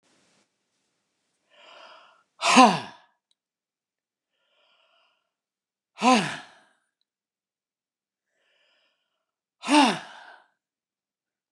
{
  "exhalation_length": "11.5 s",
  "exhalation_amplitude": 28827,
  "exhalation_signal_mean_std_ratio": 0.21,
  "survey_phase": "beta (2021-08-13 to 2022-03-07)",
  "age": "65+",
  "gender": "Male",
  "wearing_mask": "No",
  "symptom_none": true,
  "smoker_status": "Ex-smoker",
  "respiratory_condition_asthma": false,
  "respiratory_condition_other": false,
  "recruitment_source": "REACT",
  "submission_delay": "2 days",
  "covid_test_result": "Negative",
  "covid_test_method": "RT-qPCR",
  "influenza_a_test_result": "Negative",
  "influenza_b_test_result": "Negative"
}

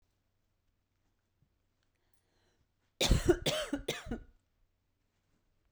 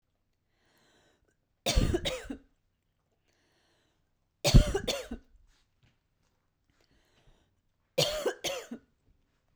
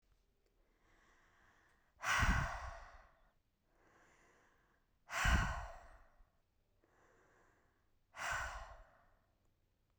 {
  "cough_length": "5.7 s",
  "cough_amplitude": 7508,
  "cough_signal_mean_std_ratio": 0.27,
  "three_cough_length": "9.6 s",
  "three_cough_amplitude": 16128,
  "three_cough_signal_mean_std_ratio": 0.26,
  "exhalation_length": "10.0 s",
  "exhalation_amplitude": 2829,
  "exhalation_signal_mean_std_ratio": 0.33,
  "survey_phase": "beta (2021-08-13 to 2022-03-07)",
  "age": "18-44",
  "gender": "Female",
  "wearing_mask": "No",
  "symptom_fatigue": true,
  "symptom_onset": "5 days",
  "smoker_status": "Current smoker (1 to 10 cigarettes per day)",
  "respiratory_condition_asthma": true,
  "respiratory_condition_other": false,
  "recruitment_source": "Test and Trace",
  "submission_delay": "1 day",
  "covid_test_result": "Negative",
  "covid_test_method": "RT-qPCR"
}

